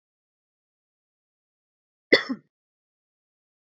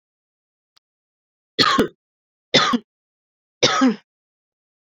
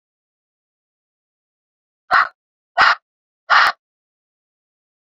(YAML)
cough_length: 3.8 s
cough_amplitude: 23939
cough_signal_mean_std_ratio: 0.13
three_cough_length: 4.9 s
three_cough_amplitude: 29806
three_cough_signal_mean_std_ratio: 0.33
exhalation_length: 5.0 s
exhalation_amplitude: 28758
exhalation_signal_mean_std_ratio: 0.26
survey_phase: beta (2021-08-13 to 2022-03-07)
age: 18-44
gender: Female
wearing_mask: 'No'
symptom_cough_any: true
symptom_other: true
smoker_status: Never smoked
respiratory_condition_asthma: false
respiratory_condition_other: false
recruitment_source: Test and Trace
submission_delay: 3 days
covid_test_result: Positive
covid_test_method: RT-qPCR
covid_ct_value: 29.7
covid_ct_gene: ORF1ab gene
covid_ct_mean: 30.5
covid_viral_load: 99 copies/ml
covid_viral_load_category: Minimal viral load (< 10K copies/ml)